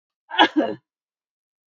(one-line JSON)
{"cough_length": "1.7 s", "cough_amplitude": 26061, "cough_signal_mean_std_ratio": 0.3, "survey_phase": "beta (2021-08-13 to 2022-03-07)", "age": "45-64", "gender": "Female", "wearing_mask": "No", "symptom_none": true, "smoker_status": "Never smoked", "respiratory_condition_asthma": false, "respiratory_condition_other": false, "recruitment_source": "REACT", "submission_delay": "3 days", "covid_test_result": "Negative", "covid_test_method": "RT-qPCR"}